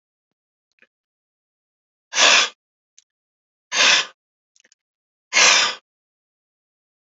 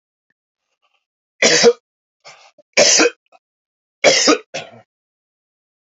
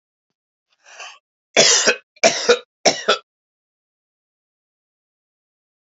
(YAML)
exhalation_length: 7.2 s
exhalation_amplitude: 31060
exhalation_signal_mean_std_ratio: 0.3
three_cough_length: 6.0 s
three_cough_amplitude: 31806
three_cough_signal_mean_std_ratio: 0.34
cough_length: 5.8 s
cough_amplitude: 30766
cough_signal_mean_std_ratio: 0.3
survey_phase: alpha (2021-03-01 to 2021-08-12)
age: 65+
gender: Male
wearing_mask: 'No'
symptom_none: true
smoker_status: Ex-smoker
respiratory_condition_asthma: false
respiratory_condition_other: false
recruitment_source: REACT
submission_delay: 1 day
covid_test_result: Negative
covid_test_method: RT-qPCR